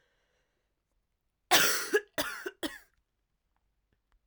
{"cough_length": "4.3 s", "cough_amplitude": 13200, "cough_signal_mean_std_ratio": 0.3, "survey_phase": "alpha (2021-03-01 to 2021-08-12)", "age": "18-44", "gender": "Female", "wearing_mask": "No", "symptom_cough_any": true, "symptom_new_continuous_cough": true, "symptom_shortness_of_breath": true, "symptom_diarrhoea": true, "symptom_fatigue": true, "symptom_fever_high_temperature": true, "symptom_headache": true, "symptom_change_to_sense_of_smell_or_taste": true, "symptom_loss_of_taste": true, "symptom_onset": "3 days", "smoker_status": "Current smoker (1 to 10 cigarettes per day)", "respiratory_condition_asthma": false, "respiratory_condition_other": false, "recruitment_source": "Test and Trace", "submission_delay": "2 days", "covid_test_result": "Positive", "covid_test_method": "RT-qPCR"}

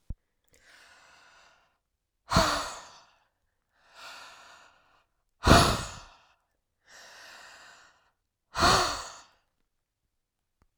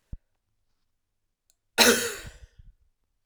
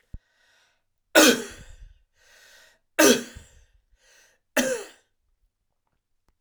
{"exhalation_length": "10.8 s", "exhalation_amplitude": 22507, "exhalation_signal_mean_std_ratio": 0.27, "cough_length": "3.3 s", "cough_amplitude": 20482, "cough_signal_mean_std_ratio": 0.25, "three_cough_length": "6.4 s", "three_cough_amplitude": 28896, "three_cough_signal_mean_std_ratio": 0.26, "survey_phase": "alpha (2021-03-01 to 2021-08-12)", "age": "45-64", "gender": "Male", "wearing_mask": "No", "symptom_none": true, "smoker_status": "Never smoked", "respiratory_condition_asthma": false, "respiratory_condition_other": false, "recruitment_source": "REACT", "submission_delay": "1 day", "covid_test_result": "Negative", "covid_test_method": "RT-qPCR"}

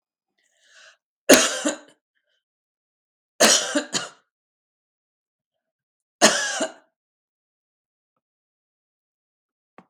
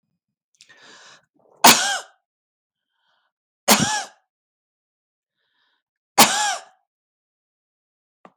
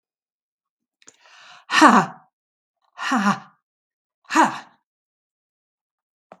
{"cough_length": "9.9 s", "cough_amplitude": 32768, "cough_signal_mean_std_ratio": 0.24, "three_cough_length": "8.4 s", "three_cough_amplitude": 32768, "three_cough_signal_mean_std_ratio": 0.24, "exhalation_length": "6.4 s", "exhalation_amplitude": 32768, "exhalation_signal_mean_std_ratio": 0.28, "survey_phase": "beta (2021-08-13 to 2022-03-07)", "age": "65+", "gender": "Female", "wearing_mask": "No", "symptom_none": true, "smoker_status": "Never smoked", "respiratory_condition_asthma": false, "respiratory_condition_other": false, "recruitment_source": "REACT", "submission_delay": "17 days", "covid_test_result": "Negative", "covid_test_method": "RT-qPCR"}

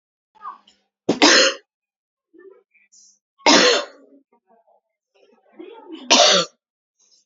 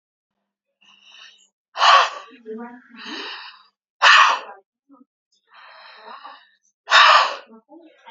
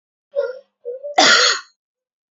{"three_cough_length": "7.3 s", "three_cough_amplitude": 32214, "three_cough_signal_mean_std_ratio": 0.33, "exhalation_length": "8.1 s", "exhalation_amplitude": 30103, "exhalation_signal_mean_std_ratio": 0.33, "cough_length": "2.3 s", "cough_amplitude": 30623, "cough_signal_mean_std_ratio": 0.43, "survey_phase": "beta (2021-08-13 to 2022-03-07)", "age": "18-44", "gender": "Female", "wearing_mask": "No", "symptom_cough_any": true, "symptom_runny_or_blocked_nose": true, "symptom_shortness_of_breath": true, "symptom_sore_throat": true, "symptom_abdominal_pain": true, "symptom_fatigue": true, "symptom_fever_high_temperature": true, "symptom_headache": true, "symptom_change_to_sense_of_smell_or_taste": true, "symptom_other": true, "smoker_status": "Ex-smoker", "respiratory_condition_asthma": false, "respiratory_condition_other": false, "recruitment_source": "Test and Trace", "submission_delay": "1 day", "covid_test_result": "Positive", "covid_test_method": "RT-qPCR", "covid_ct_value": 18.7, "covid_ct_gene": "ORF1ab gene", "covid_ct_mean": 19.5, "covid_viral_load": "400000 copies/ml", "covid_viral_load_category": "Low viral load (10K-1M copies/ml)"}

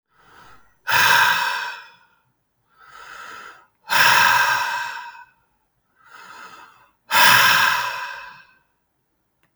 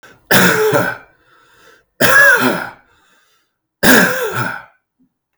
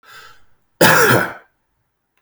{"exhalation_length": "9.6 s", "exhalation_amplitude": 32768, "exhalation_signal_mean_std_ratio": 0.45, "three_cough_length": "5.4 s", "three_cough_amplitude": 32768, "three_cough_signal_mean_std_ratio": 0.5, "cough_length": "2.2 s", "cough_amplitude": 32768, "cough_signal_mean_std_ratio": 0.4, "survey_phase": "alpha (2021-03-01 to 2021-08-12)", "age": "45-64", "gender": "Male", "wearing_mask": "No", "symptom_none": true, "smoker_status": "Ex-smoker", "respiratory_condition_asthma": false, "respiratory_condition_other": false, "recruitment_source": "REACT", "submission_delay": "2 days", "covid_test_result": "Negative", "covid_test_method": "RT-qPCR"}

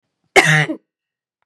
{"cough_length": "1.5 s", "cough_amplitude": 32768, "cough_signal_mean_std_ratio": 0.37, "survey_phase": "beta (2021-08-13 to 2022-03-07)", "age": "18-44", "gender": "Female", "wearing_mask": "No", "symptom_cough_any": true, "symptom_runny_or_blocked_nose": true, "symptom_onset": "12 days", "smoker_status": "Ex-smoker", "respiratory_condition_asthma": false, "respiratory_condition_other": false, "recruitment_source": "REACT", "submission_delay": "2 days", "covid_test_result": "Negative", "covid_test_method": "RT-qPCR", "influenza_a_test_result": "Negative", "influenza_b_test_result": "Negative"}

